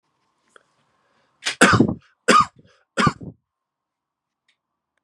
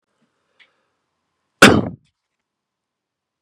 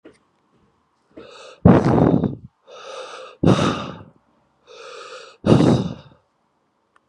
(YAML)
three_cough_length: 5.0 s
three_cough_amplitude: 32668
three_cough_signal_mean_std_ratio: 0.29
cough_length: 3.4 s
cough_amplitude: 32768
cough_signal_mean_std_ratio: 0.19
exhalation_length: 7.1 s
exhalation_amplitude: 32575
exhalation_signal_mean_std_ratio: 0.38
survey_phase: beta (2021-08-13 to 2022-03-07)
age: 18-44
gender: Male
wearing_mask: 'No'
symptom_cough_any: true
symptom_runny_or_blocked_nose: true
symptom_sore_throat: true
symptom_onset: 2 days
smoker_status: Ex-smoker
respiratory_condition_asthma: false
respiratory_condition_other: false
recruitment_source: Test and Trace
submission_delay: 1 day
covid_test_result: Positive
covid_test_method: RT-qPCR
covid_ct_value: 20.7
covid_ct_gene: N gene
covid_ct_mean: 21.2
covid_viral_load: 110000 copies/ml
covid_viral_load_category: Low viral load (10K-1M copies/ml)